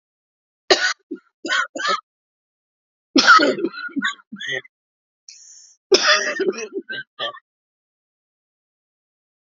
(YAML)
three_cough_length: 9.6 s
three_cough_amplitude: 32767
three_cough_signal_mean_std_ratio: 0.36
survey_phase: beta (2021-08-13 to 2022-03-07)
age: 65+
gender: Female
wearing_mask: 'No'
symptom_none: true
smoker_status: Ex-smoker
respiratory_condition_asthma: true
respiratory_condition_other: false
recruitment_source: Test and Trace
submission_delay: 0 days
covid_test_result: Negative
covid_test_method: LFT